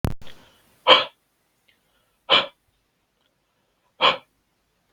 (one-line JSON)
{"exhalation_length": "4.9 s", "exhalation_amplitude": 32768, "exhalation_signal_mean_std_ratio": 0.26, "survey_phase": "beta (2021-08-13 to 2022-03-07)", "age": "18-44", "gender": "Male", "wearing_mask": "No", "symptom_none": true, "smoker_status": "Never smoked", "respiratory_condition_asthma": false, "respiratory_condition_other": false, "recruitment_source": "REACT", "submission_delay": "0 days", "covid_test_result": "Negative", "covid_test_method": "RT-qPCR", "covid_ct_value": 42.0, "covid_ct_gene": "N gene"}